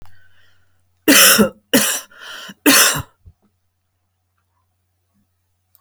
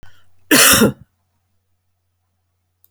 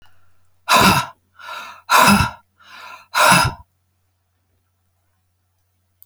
{"three_cough_length": "5.8 s", "three_cough_amplitude": 32768, "three_cough_signal_mean_std_ratio": 0.34, "cough_length": "2.9 s", "cough_amplitude": 32768, "cough_signal_mean_std_ratio": 0.32, "exhalation_length": "6.1 s", "exhalation_amplitude": 31588, "exhalation_signal_mean_std_ratio": 0.37, "survey_phase": "alpha (2021-03-01 to 2021-08-12)", "age": "65+", "gender": "Female", "wearing_mask": "No", "symptom_none": true, "smoker_status": "Never smoked", "respiratory_condition_asthma": false, "respiratory_condition_other": false, "recruitment_source": "REACT", "submission_delay": "3 days", "covid_test_result": "Negative", "covid_test_method": "RT-qPCR"}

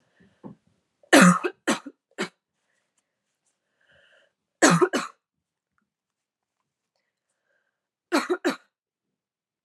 {"three_cough_length": "9.6 s", "three_cough_amplitude": 27331, "three_cough_signal_mean_std_ratio": 0.24, "survey_phase": "beta (2021-08-13 to 2022-03-07)", "age": "18-44", "gender": "Female", "wearing_mask": "Yes", "symptom_runny_or_blocked_nose": true, "symptom_sore_throat": true, "symptom_fatigue": true, "symptom_headache": true, "symptom_onset": "4 days", "smoker_status": "Never smoked", "respiratory_condition_asthma": false, "respiratory_condition_other": false, "recruitment_source": "Test and Trace", "submission_delay": "1 day", "covid_test_result": "Positive", "covid_test_method": "RT-qPCR", "covid_ct_value": 24.8, "covid_ct_gene": "N gene"}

